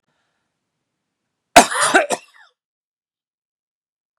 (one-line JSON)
{"cough_length": "4.2 s", "cough_amplitude": 32768, "cough_signal_mean_std_ratio": 0.22, "survey_phase": "beta (2021-08-13 to 2022-03-07)", "age": "45-64", "gender": "Male", "wearing_mask": "No", "symptom_none": true, "smoker_status": "Never smoked", "respiratory_condition_asthma": false, "respiratory_condition_other": false, "recruitment_source": "REACT", "submission_delay": "0 days", "covid_test_result": "Negative", "covid_test_method": "RT-qPCR"}